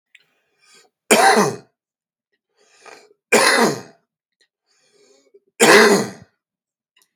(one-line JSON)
{"three_cough_length": "7.2 s", "three_cough_amplitude": 32768, "three_cough_signal_mean_std_ratio": 0.35, "survey_phase": "beta (2021-08-13 to 2022-03-07)", "age": "45-64", "gender": "Male", "wearing_mask": "No", "symptom_cough_any": true, "smoker_status": "Ex-smoker", "respiratory_condition_asthma": false, "respiratory_condition_other": false, "recruitment_source": "REACT", "submission_delay": "0 days", "covid_test_result": "Negative", "covid_test_method": "RT-qPCR"}